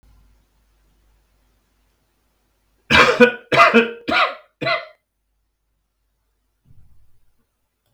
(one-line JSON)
{"cough_length": "7.9 s", "cough_amplitude": 32768, "cough_signal_mean_std_ratio": 0.29, "survey_phase": "beta (2021-08-13 to 2022-03-07)", "age": "65+", "gender": "Male", "wearing_mask": "No", "symptom_none": true, "smoker_status": "Ex-smoker", "respiratory_condition_asthma": false, "respiratory_condition_other": false, "recruitment_source": "REACT", "submission_delay": "2 days", "covid_test_result": "Negative", "covid_test_method": "RT-qPCR", "influenza_a_test_result": "Unknown/Void", "influenza_b_test_result": "Unknown/Void"}